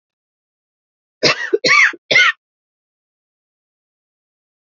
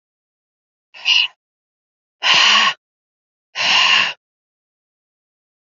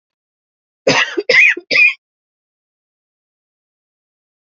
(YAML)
three_cough_length: 4.8 s
three_cough_amplitude: 32152
three_cough_signal_mean_std_ratio: 0.31
exhalation_length: 5.7 s
exhalation_amplitude: 29490
exhalation_signal_mean_std_ratio: 0.39
cough_length: 4.5 s
cough_amplitude: 29942
cough_signal_mean_std_ratio: 0.33
survey_phase: beta (2021-08-13 to 2022-03-07)
age: 18-44
gender: Female
wearing_mask: 'No'
symptom_runny_or_blocked_nose: true
symptom_fatigue: true
symptom_headache: true
symptom_change_to_sense_of_smell_or_taste: true
smoker_status: Never smoked
respiratory_condition_asthma: false
respiratory_condition_other: false
recruitment_source: Test and Trace
submission_delay: 3 days
covid_test_result: Positive
covid_test_method: LFT